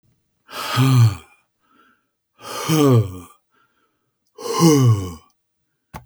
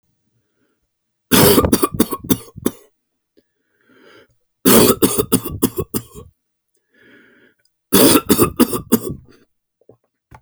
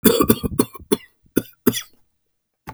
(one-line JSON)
{"exhalation_length": "6.1 s", "exhalation_amplitude": 26107, "exhalation_signal_mean_std_ratio": 0.44, "three_cough_length": "10.4 s", "three_cough_amplitude": 32768, "three_cough_signal_mean_std_ratio": 0.37, "cough_length": "2.7 s", "cough_amplitude": 32768, "cough_signal_mean_std_ratio": 0.35, "survey_phase": "beta (2021-08-13 to 2022-03-07)", "age": "65+", "gender": "Male", "wearing_mask": "No", "symptom_none": true, "smoker_status": "Never smoked", "respiratory_condition_asthma": false, "respiratory_condition_other": false, "recruitment_source": "REACT", "submission_delay": "3 days", "covid_test_result": "Negative", "covid_test_method": "RT-qPCR"}